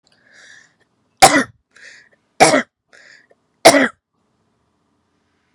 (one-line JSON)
{"three_cough_length": "5.5 s", "three_cough_amplitude": 32768, "three_cough_signal_mean_std_ratio": 0.26, "survey_phase": "beta (2021-08-13 to 2022-03-07)", "age": "18-44", "gender": "Female", "wearing_mask": "No", "symptom_none": true, "symptom_onset": "8 days", "smoker_status": "Ex-smoker", "respiratory_condition_asthma": false, "respiratory_condition_other": false, "recruitment_source": "REACT", "submission_delay": "3 days", "covid_test_result": "Negative", "covid_test_method": "RT-qPCR"}